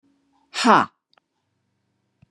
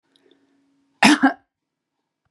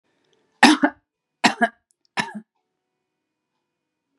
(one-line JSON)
{"exhalation_length": "2.3 s", "exhalation_amplitude": 28215, "exhalation_signal_mean_std_ratio": 0.25, "cough_length": "2.3 s", "cough_amplitude": 32131, "cough_signal_mean_std_ratio": 0.26, "three_cough_length": "4.2 s", "three_cough_amplitude": 32714, "three_cough_signal_mean_std_ratio": 0.24, "survey_phase": "beta (2021-08-13 to 2022-03-07)", "age": "65+", "gender": "Female", "wearing_mask": "No", "symptom_cough_any": true, "symptom_onset": "12 days", "smoker_status": "Ex-smoker", "respiratory_condition_asthma": false, "respiratory_condition_other": false, "recruitment_source": "REACT", "submission_delay": "2 days", "covid_test_result": "Negative", "covid_test_method": "RT-qPCR", "influenza_a_test_result": "Negative", "influenza_b_test_result": "Negative"}